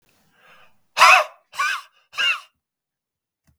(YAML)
exhalation_length: 3.6 s
exhalation_amplitude: 32768
exhalation_signal_mean_std_ratio: 0.31
survey_phase: beta (2021-08-13 to 2022-03-07)
age: 45-64
gender: Male
wearing_mask: 'No'
symptom_none: true
smoker_status: Ex-smoker
respiratory_condition_asthma: true
respiratory_condition_other: false
recruitment_source: REACT
submission_delay: 3 days
covid_test_result: Negative
covid_test_method: RT-qPCR
influenza_a_test_result: Negative
influenza_b_test_result: Negative